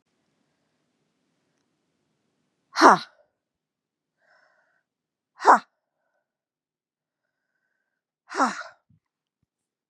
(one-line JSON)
{"exhalation_length": "9.9 s", "exhalation_amplitude": 31176, "exhalation_signal_mean_std_ratio": 0.16, "survey_phase": "beta (2021-08-13 to 2022-03-07)", "age": "45-64", "gender": "Female", "wearing_mask": "No", "symptom_cough_any": true, "symptom_new_continuous_cough": true, "symptom_runny_or_blocked_nose": true, "symptom_shortness_of_breath": true, "symptom_sore_throat": true, "symptom_fatigue": true, "symptom_fever_high_temperature": true, "symptom_headache": true, "symptom_onset": "2 days", "smoker_status": "Never smoked", "respiratory_condition_asthma": false, "respiratory_condition_other": false, "recruitment_source": "Test and Trace", "submission_delay": "1 day", "covid_test_result": "Positive", "covid_test_method": "ePCR"}